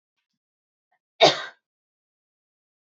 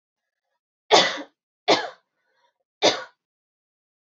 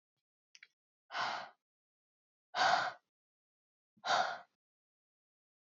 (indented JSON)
{
  "cough_length": "2.9 s",
  "cough_amplitude": 26847,
  "cough_signal_mean_std_ratio": 0.17,
  "three_cough_length": "4.0 s",
  "three_cough_amplitude": 26452,
  "three_cough_signal_mean_std_ratio": 0.28,
  "exhalation_length": "5.6 s",
  "exhalation_amplitude": 4110,
  "exhalation_signal_mean_std_ratio": 0.32,
  "survey_phase": "alpha (2021-03-01 to 2021-08-12)",
  "age": "18-44",
  "gender": "Female",
  "wearing_mask": "No",
  "symptom_cough_any": true,
  "symptom_fatigue": true,
  "symptom_fever_high_temperature": true,
  "symptom_headache": true,
  "symptom_change_to_sense_of_smell_or_taste": true,
  "symptom_onset": "2 days",
  "smoker_status": "Never smoked",
  "respiratory_condition_asthma": false,
  "respiratory_condition_other": false,
  "recruitment_source": "Test and Trace",
  "submission_delay": "2 days",
  "covid_test_result": "Positive",
  "covid_test_method": "RT-qPCR",
  "covid_ct_value": 15.0,
  "covid_ct_gene": "ORF1ab gene",
  "covid_ct_mean": 15.3,
  "covid_viral_load": "9600000 copies/ml",
  "covid_viral_load_category": "High viral load (>1M copies/ml)"
}